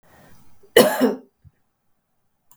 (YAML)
cough_length: 2.6 s
cough_amplitude: 32767
cough_signal_mean_std_ratio: 0.28
survey_phase: beta (2021-08-13 to 2022-03-07)
age: 45-64
gender: Female
wearing_mask: 'No'
symptom_none: true
smoker_status: Never smoked
respiratory_condition_asthma: false
respiratory_condition_other: false
recruitment_source: REACT
submission_delay: 3 days
covid_test_result: Negative
covid_test_method: RT-qPCR